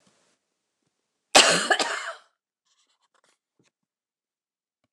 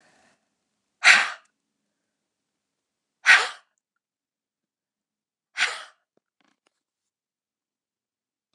{
  "cough_length": "4.9 s",
  "cough_amplitude": 29203,
  "cough_signal_mean_std_ratio": 0.24,
  "exhalation_length": "8.5 s",
  "exhalation_amplitude": 28007,
  "exhalation_signal_mean_std_ratio": 0.19,
  "survey_phase": "beta (2021-08-13 to 2022-03-07)",
  "age": "65+",
  "gender": "Female",
  "wearing_mask": "No",
  "symptom_cough_any": true,
  "symptom_fatigue": true,
  "symptom_onset": "12 days",
  "smoker_status": "Ex-smoker",
  "respiratory_condition_asthma": false,
  "respiratory_condition_other": false,
  "recruitment_source": "REACT",
  "submission_delay": "6 days",
  "covid_test_result": "Negative",
  "covid_test_method": "RT-qPCR",
  "influenza_a_test_result": "Unknown/Void",
  "influenza_b_test_result": "Unknown/Void"
}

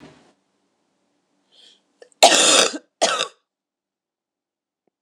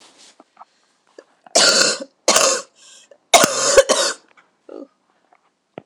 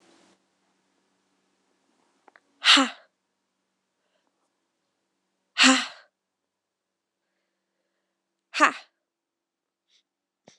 {
  "cough_length": "5.0 s",
  "cough_amplitude": 26028,
  "cough_signal_mean_std_ratio": 0.29,
  "three_cough_length": "5.9 s",
  "three_cough_amplitude": 26028,
  "three_cough_signal_mean_std_ratio": 0.39,
  "exhalation_length": "10.6 s",
  "exhalation_amplitude": 25036,
  "exhalation_signal_mean_std_ratio": 0.19,
  "survey_phase": "alpha (2021-03-01 to 2021-08-12)",
  "age": "18-44",
  "gender": "Female",
  "wearing_mask": "No",
  "symptom_cough_any": true,
  "symptom_fatigue": true,
  "symptom_headache": true,
  "symptom_change_to_sense_of_smell_or_taste": true,
  "symptom_onset": "5 days",
  "smoker_status": "Never smoked",
  "respiratory_condition_asthma": false,
  "respiratory_condition_other": false,
  "recruitment_source": "Test and Trace",
  "submission_delay": "1 day",
  "covid_test_result": "Positive",
  "covid_test_method": "RT-qPCR",
  "covid_ct_value": 20.3,
  "covid_ct_gene": "N gene",
  "covid_ct_mean": 20.7,
  "covid_viral_load": "160000 copies/ml",
  "covid_viral_load_category": "Low viral load (10K-1M copies/ml)"
}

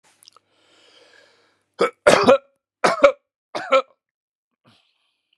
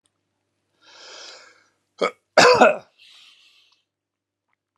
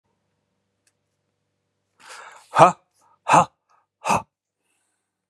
{
  "three_cough_length": "5.4 s",
  "three_cough_amplitude": 32767,
  "three_cough_signal_mean_std_ratio": 0.29,
  "cough_length": "4.8 s",
  "cough_amplitude": 30508,
  "cough_signal_mean_std_ratio": 0.25,
  "exhalation_length": "5.3 s",
  "exhalation_amplitude": 32768,
  "exhalation_signal_mean_std_ratio": 0.22,
  "survey_phase": "beta (2021-08-13 to 2022-03-07)",
  "age": "45-64",
  "gender": "Male",
  "wearing_mask": "No",
  "symptom_none": true,
  "smoker_status": "Never smoked",
  "respiratory_condition_asthma": false,
  "respiratory_condition_other": false,
  "recruitment_source": "REACT",
  "submission_delay": "1 day",
  "covid_test_result": "Negative",
  "covid_test_method": "RT-qPCR"
}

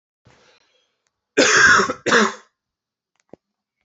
{
  "cough_length": "3.8 s",
  "cough_amplitude": 27080,
  "cough_signal_mean_std_ratio": 0.37,
  "survey_phase": "alpha (2021-03-01 to 2021-08-12)",
  "age": "18-44",
  "gender": "Male",
  "wearing_mask": "No",
  "symptom_cough_any": true,
  "symptom_fatigue": true,
  "symptom_fever_high_temperature": true,
  "symptom_headache": true,
  "smoker_status": "Never smoked",
  "respiratory_condition_asthma": false,
  "respiratory_condition_other": false,
  "recruitment_source": "Test and Trace",
  "submission_delay": "1 day",
  "covid_test_result": "Positive",
  "covid_test_method": "RT-qPCR",
  "covid_ct_value": 19.2,
  "covid_ct_gene": "ORF1ab gene"
}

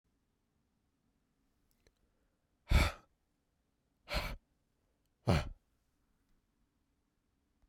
{
  "exhalation_length": "7.7 s",
  "exhalation_amplitude": 4249,
  "exhalation_signal_mean_std_ratio": 0.22,
  "survey_phase": "beta (2021-08-13 to 2022-03-07)",
  "age": "45-64",
  "gender": "Male",
  "wearing_mask": "No",
  "symptom_cough_any": true,
  "symptom_new_continuous_cough": true,
  "symptom_runny_or_blocked_nose": true,
  "symptom_shortness_of_breath": true,
  "symptom_fatigue": true,
  "symptom_headache": true,
  "symptom_change_to_sense_of_smell_or_taste": true,
  "smoker_status": "Ex-smoker",
  "respiratory_condition_asthma": false,
  "respiratory_condition_other": false,
  "recruitment_source": "Test and Trace",
  "submission_delay": "1 day",
  "covid_test_result": "Positive",
  "covid_test_method": "RT-qPCR"
}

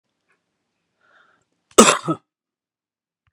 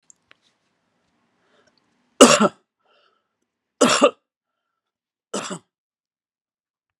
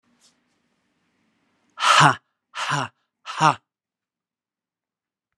{
  "cough_length": "3.3 s",
  "cough_amplitude": 32768,
  "cough_signal_mean_std_ratio": 0.19,
  "three_cough_length": "7.0 s",
  "three_cough_amplitude": 32768,
  "three_cough_signal_mean_std_ratio": 0.21,
  "exhalation_length": "5.4 s",
  "exhalation_amplitude": 28549,
  "exhalation_signal_mean_std_ratio": 0.27,
  "survey_phase": "beta (2021-08-13 to 2022-03-07)",
  "age": "45-64",
  "gender": "Male",
  "wearing_mask": "No",
  "symptom_none": true,
  "symptom_onset": "9 days",
  "smoker_status": "Never smoked",
  "respiratory_condition_asthma": false,
  "respiratory_condition_other": false,
  "recruitment_source": "REACT",
  "submission_delay": "3 days",
  "covid_test_result": "Negative",
  "covid_test_method": "RT-qPCR"
}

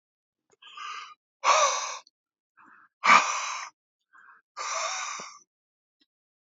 {
  "exhalation_length": "6.5 s",
  "exhalation_amplitude": 23369,
  "exhalation_signal_mean_std_ratio": 0.35,
  "survey_phase": "beta (2021-08-13 to 2022-03-07)",
  "age": "45-64",
  "gender": "Male",
  "wearing_mask": "No",
  "symptom_none": true,
  "smoker_status": "Ex-smoker",
  "respiratory_condition_asthma": false,
  "respiratory_condition_other": false,
  "recruitment_source": "REACT",
  "submission_delay": "2 days",
  "covid_test_result": "Negative",
  "covid_test_method": "RT-qPCR",
  "influenza_a_test_result": "Unknown/Void",
  "influenza_b_test_result": "Unknown/Void"
}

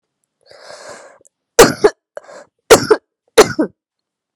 {
  "three_cough_length": "4.4 s",
  "three_cough_amplitude": 32768,
  "three_cough_signal_mean_std_ratio": 0.29,
  "survey_phase": "beta (2021-08-13 to 2022-03-07)",
  "age": "18-44",
  "gender": "Female",
  "wearing_mask": "No",
  "symptom_cough_any": true,
  "symptom_new_continuous_cough": true,
  "symptom_runny_or_blocked_nose": true,
  "symptom_shortness_of_breath": true,
  "symptom_sore_throat": true,
  "symptom_fatigue": true,
  "symptom_fever_high_temperature": true,
  "symptom_change_to_sense_of_smell_or_taste": true,
  "symptom_loss_of_taste": true,
  "symptom_onset": "3 days",
  "smoker_status": "Current smoker (1 to 10 cigarettes per day)",
  "respiratory_condition_asthma": false,
  "respiratory_condition_other": false,
  "recruitment_source": "Test and Trace",
  "submission_delay": "1 day",
  "covid_test_result": "Positive",
  "covid_test_method": "RT-qPCR",
  "covid_ct_value": 24.8,
  "covid_ct_gene": "ORF1ab gene"
}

